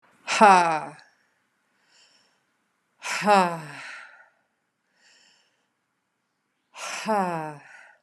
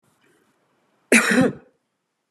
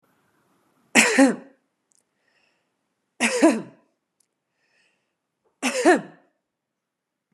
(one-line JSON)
{"exhalation_length": "8.0 s", "exhalation_amplitude": 28025, "exhalation_signal_mean_std_ratio": 0.31, "cough_length": "2.3 s", "cough_amplitude": 29963, "cough_signal_mean_std_ratio": 0.33, "three_cough_length": "7.3 s", "three_cough_amplitude": 27553, "three_cough_signal_mean_std_ratio": 0.29, "survey_phase": "beta (2021-08-13 to 2022-03-07)", "age": "45-64", "gender": "Female", "wearing_mask": "No", "symptom_none": true, "smoker_status": "Never smoked", "respiratory_condition_asthma": false, "respiratory_condition_other": false, "recruitment_source": "REACT", "submission_delay": "4 days", "covid_test_result": "Negative", "covid_test_method": "RT-qPCR", "influenza_a_test_result": "Negative", "influenza_b_test_result": "Negative"}